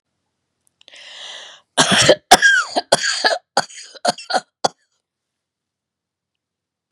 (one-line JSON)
{"cough_length": "6.9 s", "cough_amplitude": 32768, "cough_signal_mean_std_ratio": 0.34, "survey_phase": "beta (2021-08-13 to 2022-03-07)", "age": "65+", "gender": "Female", "wearing_mask": "No", "symptom_none": true, "smoker_status": "Never smoked", "respiratory_condition_asthma": false, "respiratory_condition_other": false, "recruitment_source": "REACT", "submission_delay": "2 days", "covid_test_result": "Negative", "covid_test_method": "RT-qPCR", "influenza_a_test_result": "Unknown/Void", "influenza_b_test_result": "Unknown/Void"}